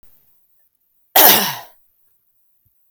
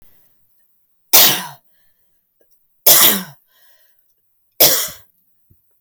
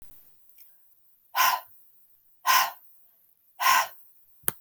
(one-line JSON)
{"cough_length": "2.9 s", "cough_amplitude": 32768, "cough_signal_mean_std_ratio": 0.27, "three_cough_length": "5.8 s", "three_cough_amplitude": 32768, "three_cough_signal_mean_std_ratio": 0.31, "exhalation_length": "4.6 s", "exhalation_amplitude": 26700, "exhalation_signal_mean_std_ratio": 0.35, "survey_phase": "alpha (2021-03-01 to 2021-08-12)", "age": "18-44", "gender": "Female", "wearing_mask": "No", "symptom_none": true, "smoker_status": "Ex-smoker", "respiratory_condition_asthma": false, "respiratory_condition_other": false, "recruitment_source": "REACT", "submission_delay": "1 day", "covid_test_result": "Negative", "covid_test_method": "RT-qPCR"}